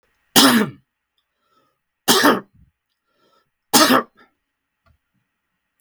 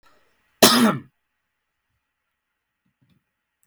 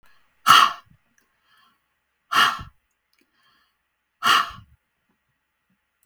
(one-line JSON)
{"three_cough_length": "5.8 s", "three_cough_amplitude": 32768, "three_cough_signal_mean_std_ratio": 0.32, "cough_length": "3.7 s", "cough_amplitude": 32768, "cough_signal_mean_std_ratio": 0.23, "exhalation_length": "6.1 s", "exhalation_amplitude": 32766, "exhalation_signal_mean_std_ratio": 0.26, "survey_phase": "beta (2021-08-13 to 2022-03-07)", "age": "45-64", "gender": "Male", "wearing_mask": "No", "symptom_runny_or_blocked_nose": true, "smoker_status": "Never smoked", "respiratory_condition_asthma": false, "respiratory_condition_other": false, "recruitment_source": "REACT", "submission_delay": "1 day", "covid_test_result": "Negative", "covid_test_method": "RT-qPCR"}